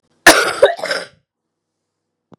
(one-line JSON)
{"cough_length": "2.4 s", "cough_amplitude": 32768, "cough_signal_mean_std_ratio": 0.34, "survey_phase": "beta (2021-08-13 to 2022-03-07)", "age": "45-64", "gender": "Female", "wearing_mask": "No", "symptom_cough_any": true, "symptom_runny_or_blocked_nose": true, "symptom_diarrhoea": true, "symptom_fatigue": true, "symptom_headache": true, "symptom_change_to_sense_of_smell_or_taste": true, "symptom_onset": "4 days", "smoker_status": "Ex-smoker", "respiratory_condition_asthma": false, "respiratory_condition_other": false, "recruitment_source": "Test and Trace", "submission_delay": "2 days", "covid_test_result": "Positive", "covid_test_method": "RT-qPCR", "covid_ct_value": 16.6, "covid_ct_gene": "ORF1ab gene", "covid_ct_mean": 17.7, "covid_viral_load": "1500000 copies/ml", "covid_viral_load_category": "High viral load (>1M copies/ml)"}